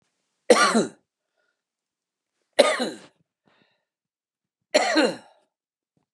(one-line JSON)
{"three_cough_length": "6.1 s", "three_cough_amplitude": 28778, "three_cough_signal_mean_std_ratio": 0.3, "survey_phase": "beta (2021-08-13 to 2022-03-07)", "age": "45-64", "gender": "Male", "wearing_mask": "No", "symptom_none": true, "smoker_status": "Ex-smoker", "respiratory_condition_asthma": false, "respiratory_condition_other": false, "recruitment_source": "REACT", "submission_delay": "20 days", "covid_test_result": "Negative", "covid_test_method": "RT-qPCR", "influenza_a_test_result": "Negative", "influenza_b_test_result": "Negative"}